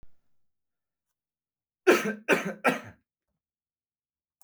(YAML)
three_cough_length: 4.4 s
three_cough_amplitude: 16605
three_cough_signal_mean_std_ratio: 0.27
survey_phase: beta (2021-08-13 to 2022-03-07)
age: 18-44
gender: Male
wearing_mask: 'No'
symptom_cough_any: true
symptom_runny_or_blocked_nose: true
smoker_status: Ex-smoker
respiratory_condition_asthma: false
respiratory_condition_other: false
recruitment_source: REACT
submission_delay: 3 days
covid_test_result: Negative
covid_test_method: RT-qPCR
covid_ct_value: 38.0
covid_ct_gene: N gene
influenza_a_test_result: Negative
influenza_b_test_result: Negative